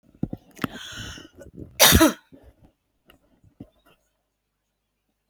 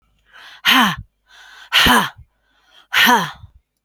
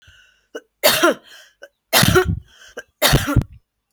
{"cough_length": "5.3 s", "cough_amplitude": 28749, "cough_signal_mean_std_ratio": 0.24, "exhalation_length": "3.8 s", "exhalation_amplitude": 32642, "exhalation_signal_mean_std_ratio": 0.44, "three_cough_length": "3.9 s", "three_cough_amplitude": 32768, "three_cough_signal_mean_std_ratio": 0.44, "survey_phase": "beta (2021-08-13 to 2022-03-07)", "age": "45-64", "gender": "Female", "wearing_mask": "No", "symptom_cough_any": true, "symptom_runny_or_blocked_nose": true, "symptom_sore_throat": true, "symptom_onset": "2 days", "smoker_status": "Ex-smoker", "respiratory_condition_asthma": true, "respiratory_condition_other": false, "recruitment_source": "REACT", "submission_delay": "1 day", "covid_test_result": "Negative", "covid_test_method": "RT-qPCR", "influenza_a_test_result": "Unknown/Void", "influenza_b_test_result": "Unknown/Void"}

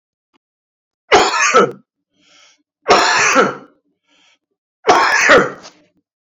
{"three_cough_length": "6.2 s", "three_cough_amplitude": 32767, "three_cough_signal_mean_std_ratio": 0.46, "survey_phase": "beta (2021-08-13 to 2022-03-07)", "age": "45-64", "gender": "Male", "wearing_mask": "No", "symptom_cough_any": true, "symptom_fatigue": true, "smoker_status": "Never smoked", "respiratory_condition_asthma": false, "respiratory_condition_other": false, "recruitment_source": "Test and Trace", "submission_delay": "1 day", "covid_test_result": "Positive", "covid_test_method": "RT-qPCR"}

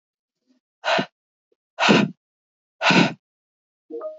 {"exhalation_length": "4.2 s", "exhalation_amplitude": 25813, "exhalation_signal_mean_std_ratio": 0.36, "survey_phase": "beta (2021-08-13 to 2022-03-07)", "age": "18-44", "gender": "Female", "wearing_mask": "No", "symptom_none": true, "smoker_status": "Never smoked", "respiratory_condition_asthma": false, "respiratory_condition_other": false, "recruitment_source": "REACT", "submission_delay": "2 days", "covid_test_result": "Negative", "covid_test_method": "RT-qPCR", "influenza_a_test_result": "Negative", "influenza_b_test_result": "Negative"}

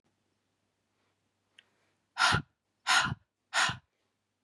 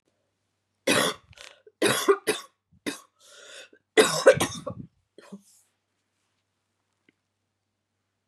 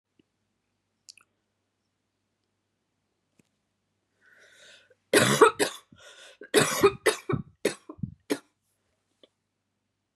{"exhalation_length": "4.4 s", "exhalation_amplitude": 7612, "exhalation_signal_mean_std_ratio": 0.31, "three_cough_length": "8.3 s", "three_cough_amplitude": 24641, "three_cough_signal_mean_std_ratio": 0.28, "cough_length": "10.2 s", "cough_amplitude": 19640, "cough_signal_mean_std_ratio": 0.25, "survey_phase": "beta (2021-08-13 to 2022-03-07)", "age": "45-64", "gender": "Female", "wearing_mask": "No", "symptom_cough_any": true, "symptom_runny_or_blocked_nose": true, "symptom_sore_throat": true, "symptom_other": true, "smoker_status": "Never smoked", "respiratory_condition_asthma": false, "respiratory_condition_other": false, "recruitment_source": "Test and Trace", "submission_delay": "1 day", "covid_test_result": "Positive", "covid_test_method": "LFT"}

